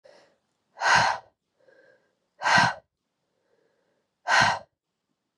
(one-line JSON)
{"exhalation_length": "5.4 s", "exhalation_amplitude": 17502, "exhalation_signal_mean_std_ratio": 0.34, "survey_phase": "beta (2021-08-13 to 2022-03-07)", "age": "18-44", "gender": "Female", "wearing_mask": "No", "symptom_cough_any": true, "symptom_runny_or_blocked_nose": true, "symptom_shortness_of_breath": true, "symptom_fatigue": true, "symptom_fever_high_temperature": true, "symptom_headache": true, "symptom_change_to_sense_of_smell_or_taste": true, "symptom_loss_of_taste": true, "symptom_other": true, "symptom_onset": "4 days", "smoker_status": "Never smoked", "respiratory_condition_asthma": true, "respiratory_condition_other": true, "recruitment_source": "Test and Trace", "submission_delay": "2 days", "covid_test_result": "Positive", "covid_test_method": "LAMP"}